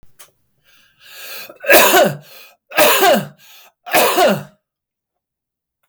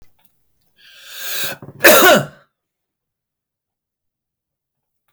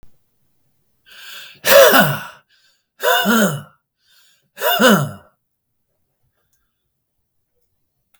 {
  "three_cough_length": "5.9 s",
  "three_cough_amplitude": 32768,
  "three_cough_signal_mean_std_ratio": 0.45,
  "cough_length": "5.1 s",
  "cough_amplitude": 32768,
  "cough_signal_mean_std_ratio": 0.28,
  "exhalation_length": "8.2 s",
  "exhalation_amplitude": 32768,
  "exhalation_signal_mean_std_ratio": 0.35,
  "survey_phase": "beta (2021-08-13 to 2022-03-07)",
  "age": "45-64",
  "gender": "Male",
  "wearing_mask": "No",
  "symptom_none": true,
  "smoker_status": "Never smoked",
  "respiratory_condition_asthma": false,
  "respiratory_condition_other": false,
  "recruitment_source": "REACT",
  "submission_delay": "1 day",
  "covid_test_result": "Negative",
  "covid_test_method": "RT-qPCR"
}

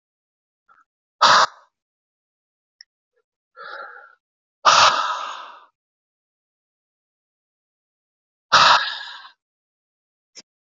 {
  "exhalation_length": "10.8 s",
  "exhalation_amplitude": 27440,
  "exhalation_signal_mean_std_ratio": 0.27,
  "survey_phase": "alpha (2021-03-01 to 2021-08-12)",
  "age": "18-44",
  "gender": "Male",
  "wearing_mask": "No",
  "symptom_none": true,
  "smoker_status": "Current smoker (11 or more cigarettes per day)",
  "respiratory_condition_asthma": true,
  "respiratory_condition_other": false,
  "recruitment_source": "REACT",
  "submission_delay": "4 days",
  "covid_test_result": "Negative",
  "covid_test_method": "RT-qPCR"
}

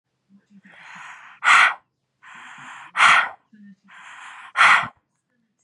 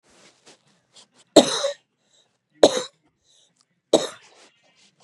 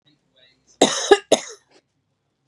{
  "exhalation_length": "5.6 s",
  "exhalation_amplitude": 27084,
  "exhalation_signal_mean_std_ratio": 0.35,
  "three_cough_length": "5.0 s",
  "three_cough_amplitude": 32768,
  "three_cough_signal_mean_std_ratio": 0.22,
  "cough_length": "2.5 s",
  "cough_amplitude": 32767,
  "cough_signal_mean_std_ratio": 0.26,
  "survey_phase": "beta (2021-08-13 to 2022-03-07)",
  "age": "18-44",
  "gender": "Female",
  "wearing_mask": "No",
  "symptom_none": true,
  "smoker_status": "Ex-smoker",
  "respiratory_condition_asthma": false,
  "respiratory_condition_other": false,
  "recruitment_source": "REACT",
  "submission_delay": "1 day",
  "covid_test_result": "Negative",
  "covid_test_method": "RT-qPCR",
  "influenza_a_test_result": "Negative",
  "influenza_b_test_result": "Negative"
}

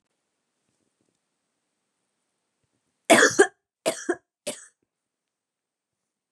{
  "three_cough_length": "6.3 s",
  "three_cough_amplitude": 23906,
  "three_cough_signal_mean_std_ratio": 0.2,
  "survey_phase": "beta (2021-08-13 to 2022-03-07)",
  "age": "18-44",
  "gender": "Female",
  "wearing_mask": "No",
  "symptom_none": true,
  "symptom_onset": "8 days",
  "smoker_status": "Never smoked",
  "respiratory_condition_asthma": false,
  "respiratory_condition_other": false,
  "recruitment_source": "REACT",
  "submission_delay": "1 day",
  "covid_test_result": "Negative",
  "covid_test_method": "RT-qPCR",
  "influenza_a_test_result": "Negative",
  "influenza_b_test_result": "Negative"
}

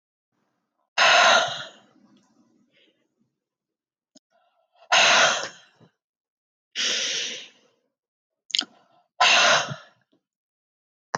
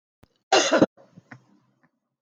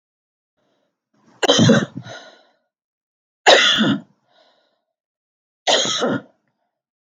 {
  "exhalation_length": "11.2 s",
  "exhalation_amplitude": 30634,
  "exhalation_signal_mean_std_ratio": 0.35,
  "cough_length": "2.2 s",
  "cough_amplitude": 20814,
  "cough_signal_mean_std_ratio": 0.3,
  "three_cough_length": "7.2 s",
  "three_cough_amplitude": 32768,
  "three_cough_signal_mean_std_ratio": 0.36,
  "survey_phase": "beta (2021-08-13 to 2022-03-07)",
  "age": "45-64",
  "gender": "Female",
  "wearing_mask": "No",
  "symptom_none": true,
  "smoker_status": "Never smoked",
  "respiratory_condition_asthma": false,
  "respiratory_condition_other": false,
  "recruitment_source": "REACT",
  "submission_delay": "2 days",
  "covid_test_result": "Negative",
  "covid_test_method": "RT-qPCR",
  "influenza_a_test_result": "Negative",
  "influenza_b_test_result": "Negative"
}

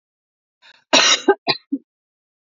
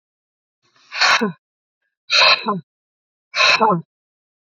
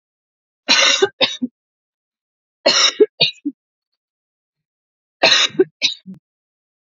{
  "cough_length": "2.6 s",
  "cough_amplitude": 32767,
  "cough_signal_mean_std_ratio": 0.32,
  "exhalation_length": "4.5 s",
  "exhalation_amplitude": 29041,
  "exhalation_signal_mean_std_ratio": 0.41,
  "three_cough_length": "6.8 s",
  "three_cough_amplitude": 32766,
  "three_cough_signal_mean_std_ratio": 0.36,
  "survey_phase": "beta (2021-08-13 to 2022-03-07)",
  "age": "45-64",
  "gender": "Female",
  "wearing_mask": "No",
  "symptom_none": true,
  "smoker_status": "Never smoked",
  "respiratory_condition_asthma": false,
  "respiratory_condition_other": false,
  "recruitment_source": "REACT",
  "submission_delay": "3 days",
  "covid_test_result": "Negative",
  "covid_test_method": "RT-qPCR"
}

